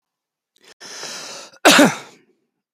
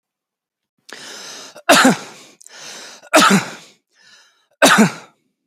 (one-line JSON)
{"cough_length": "2.7 s", "cough_amplitude": 32768, "cough_signal_mean_std_ratio": 0.3, "three_cough_length": "5.5 s", "three_cough_amplitude": 32768, "three_cough_signal_mean_std_ratio": 0.36, "survey_phase": "beta (2021-08-13 to 2022-03-07)", "age": "18-44", "gender": "Male", "wearing_mask": "No", "symptom_none": true, "smoker_status": "Never smoked", "respiratory_condition_asthma": false, "respiratory_condition_other": false, "recruitment_source": "REACT", "submission_delay": "1 day", "covid_test_result": "Negative", "covid_test_method": "RT-qPCR", "influenza_a_test_result": "Negative", "influenza_b_test_result": "Negative"}